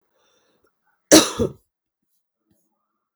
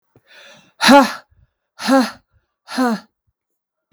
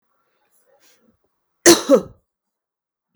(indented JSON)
{
  "three_cough_length": "3.2 s",
  "three_cough_amplitude": 32768,
  "three_cough_signal_mean_std_ratio": 0.2,
  "exhalation_length": "3.9 s",
  "exhalation_amplitude": 32767,
  "exhalation_signal_mean_std_ratio": 0.34,
  "cough_length": "3.2 s",
  "cough_amplitude": 32768,
  "cough_signal_mean_std_ratio": 0.23,
  "survey_phase": "beta (2021-08-13 to 2022-03-07)",
  "age": "45-64",
  "gender": "Female",
  "wearing_mask": "No",
  "symptom_cough_any": true,
  "symptom_runny_or_blocked_nose": true,
  "symptom_sore_throat": true,
  "symptom_fatigue": true,
  "symptom_headache": true,
  "symptom_change_to_sense_of_smell_or_taste": true,
  "symptom_onset": "3 days",
  "smoker_status": "Ex-smoker",
  "respiratory_condition_asthma": false,
  "respiratory_condition_other": false,
  "recruitment_source": "Test and Trace",
  "submission_delay": "1 day",
  "covid_test_result": "Positive",
  "covid_test_method": "RT-qPCR",
  "covid_ct_value": 21.4,
  "covid_ct_gene": "N gene",
  "covid_ct_mean": 21.5,
  "covid_viral_load": "92000 copies/ml",
  "covid_viral_load_category": "Low viral load (10K-1M copies/ml)"
}